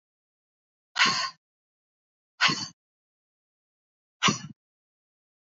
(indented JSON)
{
  "exhalation_length": "5.5 s",
  "exhalation_amplitude": 14014,
  "exhalation_signal_mean_std_ratio": 0.27,
  "survey_phase": "beta (2021-08-13 to 2022-03-07)",
  "age": "45-64",
  "gender": "Female",
  "wearing_mask": "No",
  "symptom_none": true,
  "smoker_status": "Never smoked",
  "respiratory_condition_asthma": false,
  "respiratory_condition_other": false,
  "recruitment_source": "REACT",
  "submission_delay": "1 day",
  "covid_test_result": "Negative",
  "covid_test_method": "RT-qPCR"
}